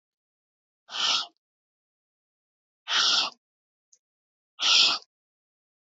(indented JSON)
{
  "exhalation_length": "5.8 s",
  "exhalation_amplitude": 13590,
  "exhalation_signal_mean_std_ratio": 0.34,
  "survey_phase": "beta (2021-08-13 to 2022-03-07)",
  "age": "65+",
  "gender": "Female",
  "wearing_mask": "No",
  "symptom_none": true,
  "smoker_status": "Never smoked",
  "respiratory_condition_asthma": false,
  "respiratory_condition_other": false,
  "recruitment_source": "REACT",
  "submission_delay": "2 days",
  "covid_test_result": "Positive",
  "covid_test_method": "RT-qPCR",
  "covid_ct_value": 32.7,
  "covid_ct_gene": "N gene",
  "influenza_a_test_result": "Negative",
  "influenza_b_test_result": "Negative"
}